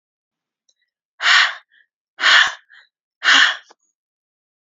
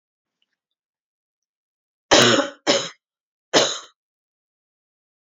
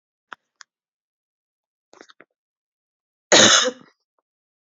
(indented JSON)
{
  "exhalation_length": "4.6 s",
  "exhalation_amplitude": 30506,
  "exhalation_signal_mean_std_ratio": 0.35,
  "three_cough_length": "5.4 s",
  "three_cough_amplitude": 28713,
  "three_cough_signal_mean_std_ratio": 0.28,
  "cough_length": "4.8 s",
  "cough_amplitude": 32768,
  "cough_signal_mean_std_ratio": 0.22,
  "survey_phase": "beta (2021-08-13 to 2022-03-07)",
  "age": "18-44",
  "gender": "Female",
  "wearing_mask": "No",
  "symptom_cough_any": true,
  "symptom_runny_or_blocked_nose": true,
  "symptom_fatigue": true,
  "symptom_other": true,
  "smoker_status": "Never smoked",
  "respiratory_condition_asthma": false,
  "respiratory_condition_other": false,
  "recruitment_source": "Test and Trace",
  "submission_delay": "2 days",
  "covid_test_result": "Positive",
  "covid_test_method": "LFT"
}